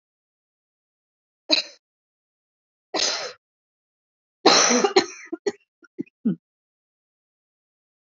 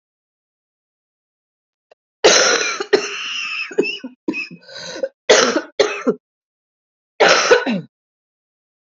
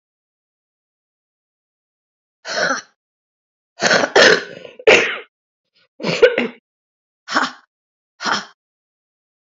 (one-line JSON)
{"three_cough_length": "8.2 s", "three_cough_amplitude": 28069, "three_cough_signal_mean_std_ratio": 0.28, "cough_length": "8.9 s", "cough_amplitude": 32768, "cough_signal_mean_std_ratio": 0.42, "exhalation_length": "9.5 s", "exhalation_amplitude": 30465, "exhalation_signal_mean_std_ratio": 0.32, "survey_phase": "beta (2021-08-13 to 2022-03-07)", "age": "45-64", "gender": "Female", "wearing_mask": "No", "symptom_cough_any": true, "symptom_runny_or_blocked_nose": true, "symptom_shortness_of_breath": true, "symptom_fatigue": true, "symptom_onset": "3 days", "smoker_status": "Current smoker (e-cigarettes or vapes only)", "respiratory_condition_asthma": true, "respiratory_condition_other": false, "recruitment_source": "Test and Trace", "submission_delay": "2 days", "covid_test_result": "Positive", "covid_test_method": "RT-qPCR", "covid_ct_value": 15.0, "covid_ct_gene": "ORF1ab gene", "covid_ct_mean": 15.5, "covid_viral_load": "8000000 copies/ml", "covid_viral_load_category": "High viral load (>1M copies/ml)"}